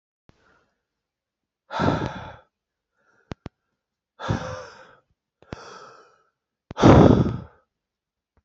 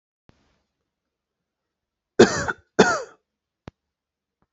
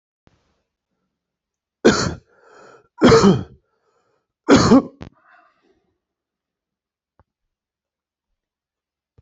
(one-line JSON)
{"exhalation_length": "8.4 s", "exhalation_amplitude": 29244, "exhalation_signal_mean_std_ratio": 0.26, "cough_length": "4.5 s", "cough_amplitude": 32767, "cough_signal_mean_std_ratio": 0.21, "three_cough_length": "9.2 s", "three_cough_amplitude": 28644, "three_cough_signal_mean_std_ratio": 0.26, "survey_phase": "alpha (2021-03-01 to 2021-08-12)", "age": "45-64", "gender": "Male", "wearing_mask": "No", "symptom_none": true, "smoker_status": "Ex-smoker", "respiratory_condition_asthma": false, "respiratory_condition_other": false, "recruitment_source": "REACT", "submission_delay": "1 day", "covid_test_result": "Negative", "covid_test_method": "RT-qPCR"}